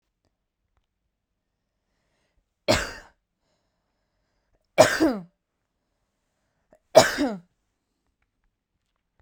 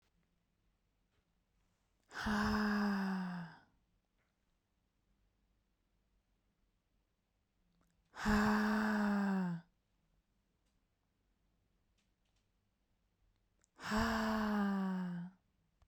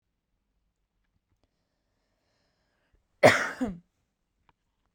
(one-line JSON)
{"three_cough_length": "9.2 s", "three_cough_amplitude": 32768, "three_cough_signal_mean_std_ratio": 0.21, "exhalation_length": "15.9 s", "exhalation_amplitude": 2595, "exhalation_signal_mean_std_ratio": 0.45, "cough_length": "4.9 s", "cough_amplitude": 21226, "cough_signal_mean_std_ratio": 0.18, "survey_phase": "beta (2021-08-13 to 2022-03-07)", "age": "18-44", "gender": "Female", "wearing_mask": "No", "symptom_fatigue": true, "smoker_status": "Never smoked", "respiratory_condition_asthma": false, "respiratory_condition_other": false, "recruitment_source": "REACT", "submission_delay": "2 days", "covid_test_result": "Negative", "covid_test_method": "RT-qPCR"}